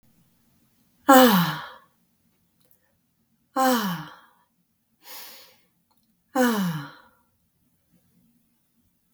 {
  "exhalation_length": "9.1 s",
  "exhalation_amplitude": 29188,
  "exhalation_signal_mean_std_ratio": 0.29,
  "survey_phase": "beta (2021-08-13 to 2022-03-07)",
  "age": "45-64",
  "gender": "Female",
  "wearing_mask": "No",
  "symptom_none": true,
  "smoker_status": "Never smoked",
  "respiratory_condition_asthma": false,
  "respiratory_condition_other": false,
  "recruitment_source": "REACT",
  "submission_delay": "1 day",
  "covid_test_result": "Negative",
  "covid_test_method": "RT-qPCR",
  "influenza_a_test_result": "Negative",
  "influenza_b_test_result": "Negative"
}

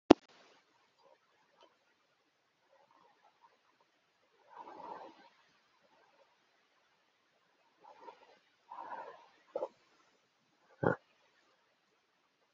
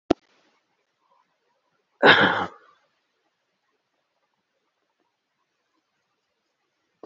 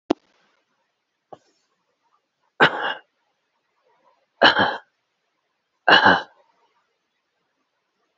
{
  "exhalation_length": "12.5 s",
  "exhalation_amplitude": 27821,
  "exhalation_signal_mean_std_ratio": 0.11,
  "cough_length": "7.1 s",
  "cough_amplitude": 28855,
  "cough_signal_mean_std_ratio": 0.18,
  "three_cough_length": "8.2 s",
  "three_cough_amplitude": 31241,
  "three_cough_signal_mean_std_ratio": 0.25,
  "survey_phase": "beta (2021-08-13 to 2022-03-07)",
  "age": "18-44",
  "gender": "Male",
  "wearing_mask": "No",
  "symptom_none": true,
  "symptom_onset": "13 days",
  "smoker_status": "Never smoked",
  "respiratory_condition_asthma": true,
  "respiratory_condition_other": false,
  "recruitment_source": "REACT",
  "submission_delay": "2 days",
  "covid_test_result": "Negative",
  "covid_test_method": "RT-qPCR",
  "influenza_a_test_result": "Negative",
  "influenza_b_test_result": "Negative"
}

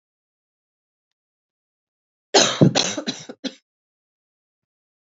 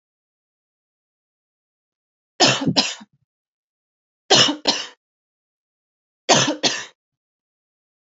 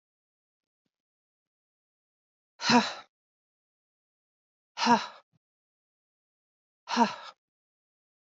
{
  "cough_length": "5.0 s",
  "cough_amplitude": 28579,
  "cough_signal_mean_std_ratio": 0.25,
  "three_cough_length": "8.2 s",
  "three_cough_amplitude": 31238,
  "three_cough_signal_mean_std_ratio": 0.29,
  "exhalation_length": "8.3 s",
  "exhalation_amplitude": 11231,
  "exhalation_signal_mean_std_ratio": 0.22,
  "survey_phase": "alpha (2021-03-01 to 2021-08-12)",
  "age": "18-44",
  "gender": "Female",
  "wearing_mask": "No",
  "symptom_cough_any": true,
  "symptom_shortness_of_breath": true,
  "symptom_fatigue": true,
  "symptom_headache": true,
  "symptom_loss_of_taste": true,
  "symptom_onset": "6 days",
  "smoker_status": "Prefer not to say",
  "respiratory_condition_asthma": false,
  "respiratory_condition_other": false,
  "recruitment_source": "Test and Trace",
  "submission_delay": "2 days",
  "covid_test_result": "Positive",
  "covid_test_method": "RT-qPCR",
  "covid_ct_value": 22.3,
  "covid_ct_gene": "ORF1ab gene",
  "covid_ct_mean": 22.4,
  "covid_viral_load": "46000 copies/ml",
  "covid_viral_load_category": "Low viral load (10K-1M copies/ml)"
}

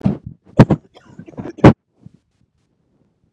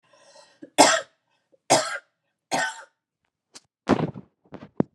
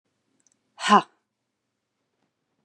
{
  "cough_length": "3.3 s",
  "cough_amplitude": 32768,
  "cough_signal_mean_std_ratio": 0.24,
  "three_cough_length": "4.9 s",
  "three_cough_amplitude": 29442,
  "three_cough_signal_mean_std_ratio": 0.3,
  "exhalation_length": "2.6 s",
  "exhalation_amplitude": 26757,
  "exhalation_signal_mean_std_ratio": 0.18,
  "survey_phase": "beta (2021-08-13 to 2022-03-07)",
  "age": "45-64",
  "gender": "Female",
  "wearing_mask": "No",
  "symptom_cough_any": true,
  "symptom_new_continuous_cough": true,
  "symptom_sore_throat": true,
  "symptom_fever_high_temperature": true,
  "symptom_headache": true,
  "symptom_onset": "2 days",
  "smoker_status": "Never smoked",
  "respiratory_condition_asthma": false,
  "respiratory_condition_other": false,
  "recruitment_source": "Test and Trace",
  "submission_delay": "1 day",
  "covid_test_result": "Positive",
  "covid_test_method": "RT-qPCR",
  "covid_ct_value": 22.2,
  "covid_ct_gene": "N gene"
}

